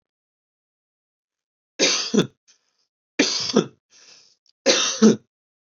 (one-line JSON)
{"three_cough_length": "5.7 s", "three_cough_amplitude": 23902, "three_cough_signal_mean_std_ratio": 0.34, "survey_phase": "beta (2021-08-13 to 2022-03-07)", "age": "18-44", "gender": "Male", "wearing_mask": "No", "symptom_none": true, "symptom_onset": "3 days", "smoker_status": "Ex-smoker", "respiratory_condition_asthma": false, "respiratory_condition_other": false, "recruitment_source": "REACT", "submission_delay": "1 day", "covid_test_result": "Negative", "covid_test_method": "RT-qPCR", "influenza_a_test_result": "Negative", "influenza_b_test_result": "Negative"}